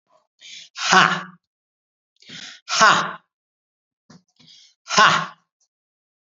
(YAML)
exhalation_length: 6.2 s
exhalation_amplitude: 32768
exhalation_signal_mean_std_ratio: 0.32
survey_phase: beta (2021-08-13 to 2022-03-07)
age: 65+
gender: Male
wearing_mask: 'No'
symptom_none: true
smoker_status: Never smoked
respiratory_condition_asthma: true
respiratory_condition_other: false
recruitment_source: REACT
submission_delay: 4 days
covid_test_result: Positive
covid_test_method: RT-qPCR
covid_ct_value: 33.4
covid_ct_gene: N gene
influenza_a_test_result: Negative
influenza_b_test_result: Negative